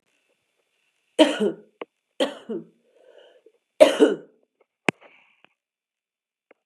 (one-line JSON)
{"three_cough_length": "6.7 s", "three_cough_amplitude": 32767, "three_cough_signal_mean_std_ratio": 0.24, "survey_phase": "beta (2021-08-13 to 2022-03-07)", "age": "45-64", "gender": "Female", "wearing_mask": "No", "symptom_cough_any": true, "symptom_runny_or_blocked_nose": true, "symptom_shortness_of_breath": true, "symptom_fatigue": true, "symptom_headache": true, "symptom_change_to_sense_of_smell_or_taste": true, "symptom_onset": "3 days", "smoker_status": "Never smoked", "respiratory_condition_asthma": false, "respiratory_condition_other": false, "recruitment_source": "Test and Trace", "submission_delay": "1 day", "covid_test_result": "Positive", "covid_test_method": "RT-qPCR", "covid_ct_value": 27.7, "covid_ct_gene": "N gene"}